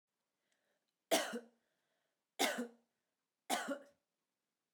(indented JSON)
{
  "three_cough_length": "4.7 s",
  "three_cough_amplitude": 3046,
  "three_cough_signal_mean_std_ratio": 0.31,
  "survey_phase": "beta (2021-08-13 to 2022-03-07)",
  "age": "45-64",
  "gender": "Female",
  "wearing_mask": "No",
  "symptom_none": true,
  "smoker_status": "Never smoked",
  "respiratory_condition_asthma": false,
  "respiratory_condition_other": false,
  "recruitment_source": "REACT",
  "submission_delay": "1 day",
  "covid_test_result": "Negative",
  "covid_test_method": "RT-qPCR",
  "influenza_a_test_result": "Unknown/Void",
  "influenza_b_test_result": "Unknown/Void"
}